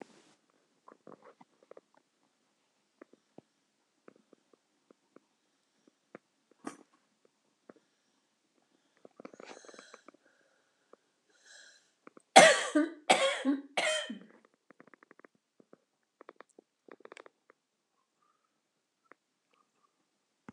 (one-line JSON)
{"cough_length": "20.5 s", "cough_amplitude": 24560, "cough_signal_mean_std_ratio": 0.17, "survey_phase": "beta (2021-08-13 to 2022-03-07)", "age": "65+", "gender": "Female", "wearing_mask": "No", "symptom_cough_any": true, "symptom_shortness_of_breath": true, "symptom_diarrhoea": true, "symptom_change_to_sense_of_smell_or_taste": true, "symptom_loss_of_taste": true, "smoker_status": "Never smoked", "respiratory_condition_asthma": false, "respiratory_condition_other": true, "recruitment_source": "REACT", "submission_delay": "8 days", "covid_test_result": "Negative", "covid_test_method": "RT-qPCR", "influenza_a_test_result": "Negative", "influenza_b_test_result": "Negative"}